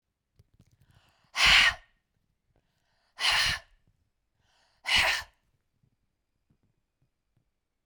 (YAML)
exhalation_length: 7.9 s
exhalation_amplitude: 14281
exhalation_signal_mean_std_ratio: 0.29
survey_phase: beta (2021-08-13 to 2022-03-07)
age: 45-64
gender: Female
wearing_mask: 'No'
symptom_none: true
smoker_status: Never smoked
respiratory_condition_asthma: false
respiratory_condition_other: false
recruitment_source: REACT
submission_delay: 2 days
covid_test_result: Negative
covid_test_method: RT-qPCR